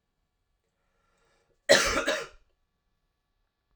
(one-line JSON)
{"cough_length": "3.8 s", "cough_amplitude": 18936, "cough_signal_mean_std_ratio": 0.26, "survey_phase": "alpha (2021-03-01 to 2021-08-12)", "age": "18-44", "gender": "Male", "wearing_mask": "No", "symptom_cough_any": true, "symptom_new_continuous_cough": true, "symptom_abdominal_pain": true, "symptom_diarrhoea": true, "symptom_fatigue": true, "symptom_fever_high_temperature": true, "symptom_headache": true, "symptom_change_to_sense_of_smell_or_taste": true, "symptom_loss_of_taste": true, "smoker_status": "Never smoked", "respiratory_condition_asthma": false, "respiratory_condition_other": false, "recruitment_source": "Test and Trace", "submission_delay": "2 days", "covid_test_result": "Positive", "covid_test_method": "RT-qPCR"}